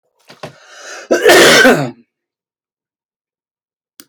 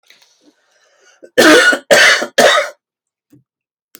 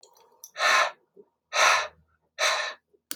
{"cough_length": "4.1 s", "cough_amplitude": 32768, "cough_signal_mean_std_ratio": 0.39, "three_cough_length": "4.0 s", "three_cough_amplitude": 32768, "three_cough_signal_mean_std_ratio": 0.44, "exhalation_length": "3.2 s", "exhalation_amplitude": 15184, "exhalation_signal_mean_std_ratio": 0.45, "survey_phase": "beta (2021-08-13 to 2022-03-07)", "age": "18-44", "gender": "Male", "wearing_mask": "No", "symptom_none": true, "symptom_onset": "13 days", "smoker_status": "Never smoked", "respiratory_condition_asthma": true, "respiratory_condition_other": false, "recruitment_source": "REACT", "submission_delay": "5 days", "covid_test_result": "Negative", "covid_test_method": "RT-qPCR", "influenza_a_test_result": "Negative", "influenza_b_test_result": "Negative"}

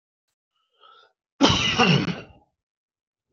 {"cough_length": "3.3 s", "cough_amplitude": 25811, "cough_signal_mean_std_ratio": 0.37, "survey_phase": "beta (2021-08-13 to 2022-03-07)", "age": "45-64", "gender": "Male", "wearing_mask": "No", "symptom_abdominal_pain": true, "symptom_onset": "12 days", "smoker_status": "Ex-smoker", "respiratory_condition_asthma": false, "respiratory_condition_other": true, "recruitment_source": "REACT", "submission_delay": "2 days", "covid_test_result": "Negative", "covid_test_method": "RT-qPCR"}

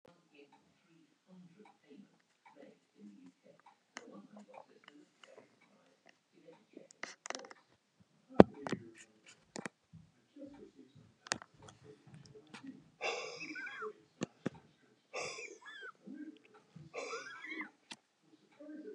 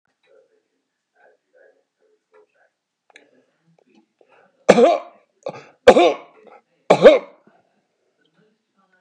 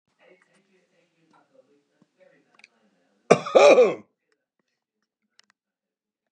{"exhalation_length": "18.9 s", "exhalation_amplitude": 32218, "exhalation_signal_mean_std_ratio": 0.19, "three_cough_length": "9.0 s", "three_cough_amplitude": 32768, "three_cough_signal_mean_std_ratio": 0.23, "cough_length": "6.3 s", "cough_amplitude": 28599, "cough_signal_mean_std_ratio": 0.22, "survey_phase": "beta (2021-08-13 to 2022-03-07)", "age": "65+", "gender": "Male", "wearing_mask": "No", "symptom_none": true, "smoker_status": "Never smoked", "respiratory_condition_asthma": false, "respiratory_condition_other": false, "recruitment_source": "REACT", "submission_delay": "2 days", "covid_test_result": "Negative", "covid_test_method": "RT-qPCR", "influenza_a_test_result": "Negative", "influenza_b_test_result": "Negative"}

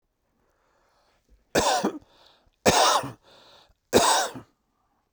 {"three_cough_length": "5.1 s", "three_cough_amplitude": 20912, "three_cough_signal_mean_std_ratio": 0.39, "survey_phase": "beta (2021-08-13 to 2022-03-07)", "age": "45-64", "gender": "Male", "wearing_mask": "Yes", "symptom_new_continuous_cough": true, "symptom_runny_or_blocked_nose": true, "symptom_shortness_of_breath": true, "symptom_abdominal_pain": true, "symptom_fatigue": true, "symptom_fever_high_temperature": true, "symptom_headache": true, "symptom_onset": "8 days", "smoker_status": "Ex-smoker", "respiratory_condition_asthma": false, "respiratory_condition_other": false, "recruitment_source": "Test and Trace", "submission_delay": "2 days", "covid_test_result": "Positive", "covid_test_method": "RT-qPCR"}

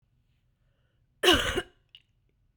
{"cough_length": "2.6 s", "cough_amplitude": 14635, "cough_signal_mean_std_ratio": 0.28, "survey_phase": "beta (2021-08-13 to 2022-03-07)", "age": "18-44", "gender": "Female", "wearing_mask": "No", "symptom_cough_any": true, "symptom_runny_or_blocked_nose": true, "symptom_diarrhoea": true, "symptom_fatigue": true, "smoker_status": "Ex-smoker", "respiratory_condition_asthma": true, "respiratory_condition_other": false, "recruitment_source": "Test and Trace", "submission_delay": "2 days", "covid_test_result": "Positive", "covid_test_method": "RT-qPCR", "covid_ct_value": 17.2, "covid_ct_gene": "ORF1ab gene", "covid_ct_mean": 18.2, "covid_viral_load": "1100000 copies/ml", "covid_viral_load_category": "High viral load (>1M copies/ml)"}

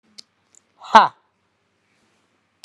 {"exhalation_length": "2.6 s", "exhalation_amplitude": 32768, "exhalation_signal_mean_std_ratio": 0.17, "survey_phase": "alpha (2021-03-01 to 2021-08-12)", "age": "65+", "gender": "Male", "wearing_mask": "No", "symptom_none": true, "smoker_status": "Never smoked", "respiratory_condition_asthma": false, "respiratory_condition_other": false, "recruitment_source": "REACT", "submission_delay": "1 day", "covid_test_result": "Negative", "covid_test_method": "RT-qPCR"}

